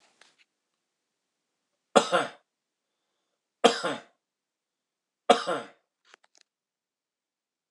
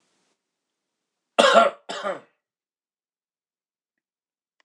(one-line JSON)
{"three_cough_length": "7.7 s", "three_cough_amplitude": 23933, "three_cough_signal_mean_std_ratio": 0.2, "cough_length": "4.6 s", "cough_amplitude": 25458, "cough_signal_mean_std_ratio": 0.23, "survey_phase": "beta (2021-08-13 to 2022-03-07)", "age": "45-64", "gender": "Male", "wearing_mask": "No", "symptom_none": true, "smoker_status": "Never smoked", "respiratory_condition_asthma": true, "respiratory_condition_other": false, "recruitment_source": "REACT", "submission_delay": "1 day", "covid_test_result": "Negative", "covid_test_method": "RT-qPCR"}